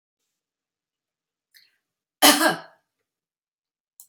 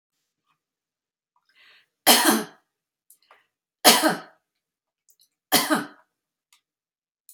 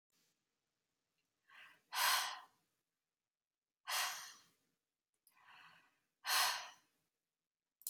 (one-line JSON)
{"cough_length": "4.1 s", "cough_amplitude": 28161, "cough_signal_mean_std_ratio": 0.21, "three_cough_length": "7.3 s", "three_cough_amplitude": 31684, "three_cough_signal_mean_std_ratio": 0.27, "exhalation_length": "7.9 s", "exhalation_amplitude": 2594, "exhalation_signal_mean_std_ratio": 0.31, "survey_phase": "beta (2021-08-13 to 2022-03-07)", "age": "45-64", "gender": "Female", "wearing_mask": "No", "symptom_none": true, "smoker_status": "Never smoked", "respiratory_condition_asthma": false, "respiratory_condition_other": false, "recruitment_source": "REACT", "submission_delay": "0 days", "covid_test_result": "Negative", "covid_test_method": "RT-qPCR", "influenza_a_test_result": "Negative", "influenza_b_test_result": "Negative"}